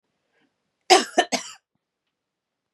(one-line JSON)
{"cough_length": "2.7 s", "cough_amplitude": 32370, "cough_signal_mean_std_ratio": 0.23, "survey_phase": "beta (2021-08-13 to 2022-03-07)", "age": "45-64", "gender": "Female", "wearing_mask": "No", "symptom_sore_throat": true, "symptom_onset": "6 days", "smoker_status": "Ex-smoker", "respiratory_condition_asthma": false, "respiratory_condition_other": false, "recruitment_source": "Test and Trace", "submission_delay": "2 days", "covid_test_result": "Negative", "covid_test_method": "RT-qPCR"}